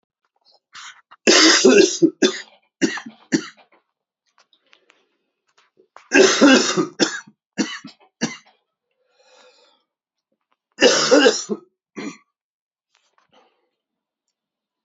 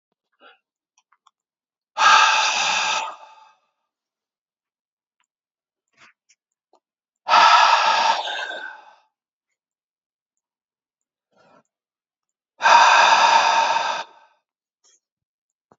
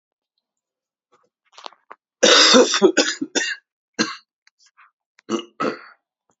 three_cough_length: 14.8 s
three_cough_amplitude: 31710
three_cough_signal_mean_std_ratio: 0.34
exhalation_length: 15.8 s
exhalation_amplitude: 27587
exhalation_signal_mean_std_ratio: 0.38
cough_length: 6.4 s
cough_amplitude: 31020
cough_signal_mean_std_ratio: 0.34
survey_phase: beta (2021-08-13 to 2022-03-07)
age: 45-64
gender: Male
wearing_mask: 'No'
symptom_cough_any: true
symptom_runny_or_blocked_nose: true
symptom_sore_throat: true
symptom_loss_of_taste: true
symptom_other: true
symptom_onset: 4 days
smoker_status: Ex-smoker
respiratory_condition_asthma: false
respiratory_condition_other: false
recruitment_source: Test and Trace
submission_delay: 2 days
covid_test_result: Positive
covid_test_method: RT-qPCR
covid_ct_value: 14.4
covid_ct_gene: N gene
covid_ct_mean: 14.9
covid_viral_load: 13000000 copies/ml
covid_viral_load_category: High viral load (>1M copies/ml)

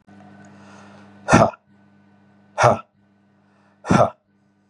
exhalation_length: 4.7 s
exhalation_amplitude: 32767
exhalation_signal_mean_std_ratio: 0.3
survey_phase: beta (2021-08-13 to 2022-03-07)
age: 18-44
gender: Male
wearing_mask: 'No'
symptom_none: true
smoker_status: Ex-smoker
respiratory_condition_asthma: false
respiratory_condition_other: false
recruitment_source: REACT
submission_delay: 2 days
covid_test_result: Negative
covid_test_method: RT-qPCR
influenza_a_test_result: Negative
influenza_b_test_result: Negative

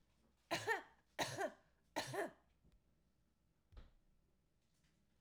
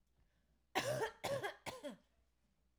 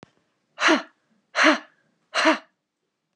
three_cough_length: 5.2 s
three_cough_amplitude: 1568
three_cough_signal_mean_std_ratio: 0.35
cough_length: 2.8 s
cough_amplitude: 2086
cough_signal_mean_std_ratio: 0.46
exhalation_length: 3.2 s
exhalation_amplitude: 23825
exhalation_signal_mean_std_ratio: 0.36
survey_phase: alpha (2021-03-01 to 2021-08-12)
age: 45-64
gender: Female
wearing_mask: 'No'
symptom_none: true
smoker_status: Never smoked
respiratory_condition_asthma: false
respiratory_condition_other: false
recruitment_source: REACT
submission_delay: 3 days
covid_test_result: Negative
covid_test_method: RT-qPCR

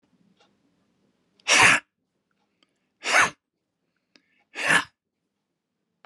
exhalation_length: 6.1 s
exhalation_amplitude: 27024
exhalation_signal_mean_std_ratio: 0.27
survey_phase: beta (2021-08-13 to 2022-03-07)
age: 45-64
gender: Male
wearing_mask: 'No'
symptom_none: true
symptom_onset: 13 days
smoker_status: Ex-smoker
respiratory_condition_asthma: false
respiratory_condition_other: false
recruitment_source: REACT
submission_delay: 3 days
covid_test_result: Negative
covid_test_method: RT-qPCR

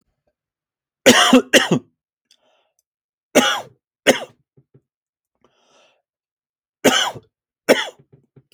three_cough_length: 8.5 s
three_cough_amplitude: 31810
three_cough_signal_mean_std_ratio: 0.29
survey_phase: alpha (2021-03-01 to 2021-08-12)
age: 45-64
gender: Male
wearing_mask: 'No'
symptom_none: true
smoker_status: Never smoked
respiratory_condition_asthma: false
respiratory_condition_other: false
recruitment_source: REACT
submission_delay: 3 days
covid_test_result: Negative
covid_test_method: RT-qPCR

